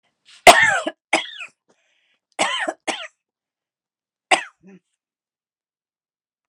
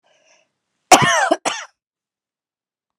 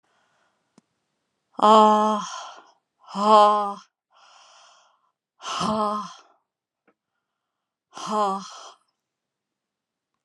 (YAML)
three_cough_length: 6.5 s
three_cough_amplitude: 32768
three_cough_signal_mean_std_ratio: 0.25
cough_length: 3.0 s
cough_amplitude: 32768
cough_signal_mean_std_ratio: 0.3
exhalation_length: 10.2 s
exhalation_amplitude: 22091
exhalation_signal_mean_std_ratio: 0.33
survey_phase: alpha (2021-03-01 to 2021-08-12)
age: 65+
gender: Female
wearing_mask: 'No'
symptom_none: true
smoker_status: Never smoked
respiratory_condition_asthma: false
respiratory_condition_other: false
recruitment_source: REACT
submission_delay: 2 days
covid_test_result: Negative
covid_test_method: RT-qPCR